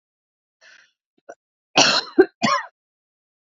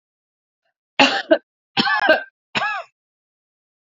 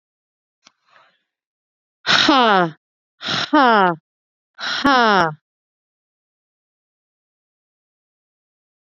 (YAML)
cough_length: 3.4 s
cough_amplitude: 32661
cough_signal_mean_std_ratio: 0.3
three_cough_length: 3.9 s
three_cough_amplitude: 32768
three_cough_signal_mean_std_ratio: 0.36
exhalation_length: 8.9 s
exhalation_amplitude: 29081
exhalation_signal_mean_std_ratio: 0.31
survey_phase: beta (2021-08-13 to 2022-03-07)
age: 18-44
gender: Female
wearing_mask: 'Yes'
symptom_cough_any: true
symptom_fatigue: true
symptom_headache: true
smoker_status: Never smoked
recruitment_source: Test and Trace
submission_delay: 1 day
covid_test_result: Positive
covid_test_method: LFT